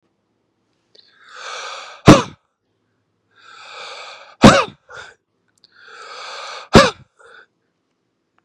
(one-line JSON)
{"exhalation_length": "8.4 s", "exhalation_amplitude": 32768, "exhalation_signal_mean_std_ratio": 0.23, "survey_phase": "beta (2021-08-13 to 2022-03-07)", "age": "45-64", "gender": "Male", "wearing_mask": "No", "symptom_runny_or_blocked_nose": true, "symptom_sore_throat": true, "symptom_headache": true, "smoker_status": "Never smoked", "respiratory_condition_asthma": false, "respiratory_condition_other": false, "recruitment_source": "Test and Trace", "submission_delay": "2 days", "covid_test_result": "Positive", "covid_test_method": "RT-qPCR", "covid_ct_value": 24.3, "covid_ct_gene": "ORF1ab gene", "covid_ct_mean": 25.3, "covid_viral_load": "5100 copies/ml", "covid_viral_load_category": "Minimal viral load (< 10K copies/ml)"}